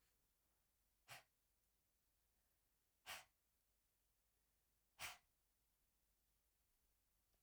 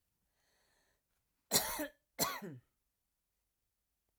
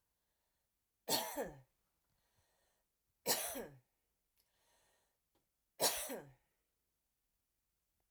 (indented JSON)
{
  "exhalation_length": "7.4 s",
  "exhalation_amplitude": 376,
  "exhalation_signal_mean_std_ratio": 0.27,
  "cough_length": "4.2 s",
  "cough_amplitude": 5433,
  "cough_signal_mean_std_ratio": 0.28,
  "three_cough_length": "8.1 s",
  "three_cough_amplitude": 3208,
  "three_cough_signal_mean_std_ratio": 0.28,
  "survey_phase": "alpha (2021-03-01 to 2021-08-12)",
  "age": "45-64",
  "gender": "Female",
  "wearing_mask": "No",
  "symptom_none": true,
  "smoker_status": "Never smoked",
  "respiratory_condition_asthma": false,
  "respiratory_condition_other": false,
  "recruitment_source": "REACT",
  "submission_delay": "0 days",
  "covid_test_result": "Negative",
  "covid_test_method": "RT-qPCR"
}